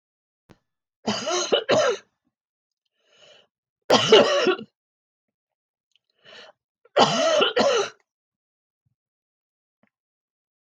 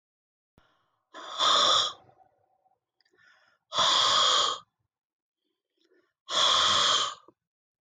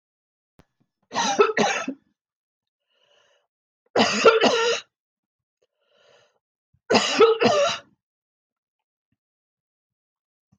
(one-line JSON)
{"three_cough_length": "10.7 s", "three_cough_amplitude": 20247, "three_cough_signal_mean_std_ratio": 0.36, "exhalation_length": "7.8 s", "exhalation_amplitude": 9200, "exhalation_signal_mean_std_ratio": 0.46, "cough_length": "10.6 s", "cough_amplitude": 19527, "cough_signal_mean_std_ratio": 0.36, "survey_phase": "alpha (2021-03-01 to 2021-08-12)", "age": "65+", "gender": "Female", "wearing_mask": "No", "symptom_none": true, "smoker_status": "Ex-smoker", "respiratory_condition_asthma": false, "respiratory_condition_other": false, "recruitment_source": "REACT", "submission_delay": "7 days", "covid_test_result": "Negative", "covid_test_method": "RT-qPCR"}